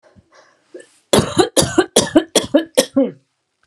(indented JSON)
{
  "cough_length": "3.7 s",
  "cough_amplitude": 32768,
  "cough_signal_mean_std_ratio": 0.42,
  "survey_phase": "alpha (2021-03-01 to 2021-08-12)",
  "age": "45-64",
  "gender": "Female",
  "wearing_mask": "No",
  "symptom_none": true,
  "smoker_status": "Never smoked",
  "respiratory_condition_asthma": false,
  "respiratory_condition_other": false,
  "recruitment_source": "REACT",
  "submission_delay": "1 day",
  "covid_test_result": "Negative",
  "covid_test_method": "RT-qPCR",
  "covid_ct_value": 39.0,
  "covid_ct_gene": "N gene"
}